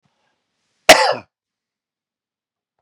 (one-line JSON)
{"cough_length": "2.8 s", "cough_amplitude": 32768, "cough_signal_mean_std_ratio": 0.2, "survey_phase": "beta (2021-08-13 to 2022-03-07)", "age": "45-64", "gender": "Male", "wearing_mask": "No", "symptom_diarrhoea": true, "symptom_onset": "12 days", "smoker_status": "Prefer not to say", "respiratory_condition_asthma": false, "respiratory_condition_other": false, "recruitment_source": "REACT", "submission_delay": "1 day", "covid_test_result": "Negative", "covid_test_method": "RT-qPCR"}